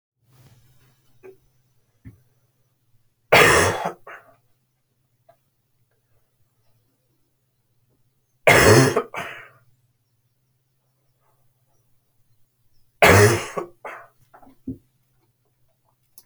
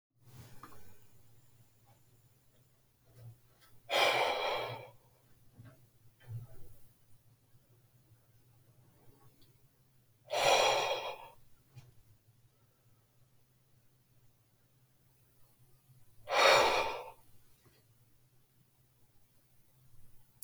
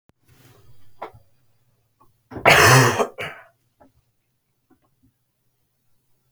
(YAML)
three_cough_length: 16.3 s
three_cough_amplitude: 30152
three_cough_signal_mean_std_ratio: 0.25
exhalation_length: 20.4 s
exhalation_amplitude: 7291
exhalation_signal_mean_std_ratio: 0.31
cough_length: 6.3 s
cough_amplitude: 31275
cough_signal_mean_std_ratio: 0.27
survey_phase: alpha (2021-03-01 to 2021-08-12)
age: 18-44
gender: Male
wearing_mask: 'Yes'
symptom_cough_any: true
symptom_fatigue: true
symptom_headache: true
symptom_change_to_sense_of_smell_or_taste: true
symptom_loss_of_taste: true
symptom_onset: 4 days
smoker_status: Never smoked
respiratory_condition_asthma: false
respiratory_condition_other: false
recruitment_source: Test and Trace
submission_delay: 1 day
covid_test_result: Positive
covid_test_method: RT-qPCR